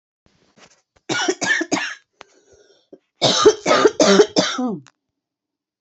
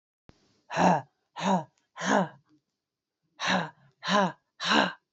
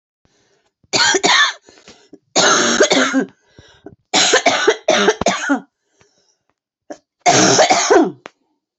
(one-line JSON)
{"three_cough_length": "5.8 s", "three_cough_amplitude": 31167, "three_cough_signal_mean_std_ratio": 0.43, "exhalation_length": "5.1 s", "exhalation_amplitude": 14576, "exhalation_signal_mean_std_ratio": 0.44, "cough_length": "8.8 s", "cough_amplitude": 31296, "cough_signal_mean_std_ratio": 0.54, "survey_phase": "beta (2021-08-13 to 2022-03-07)", "age": "18-44", "gender": "Female", "wearing_mask": "No", "symptom_cough_any": true, "symptom_shortness_of_breath": true, "symptom_sore_throat": true, "symptom_fatigue": true, "symptom_onset": "3 days", "smoker_status": "Ex-smoker", "respiratory_condition_asthma": false, "respiratory_condition_other": false, "recruitment_source": "REACT", "submission_delay": "2 days", "covid_test_result": "Positive", "covid_test_method": "RT-qPCR", "covid_ct_value": 21.0, "covid_ct_gene": "E gene", "influenza_a_test_result": "Negative", "influenza_b_test_result": "Negative"}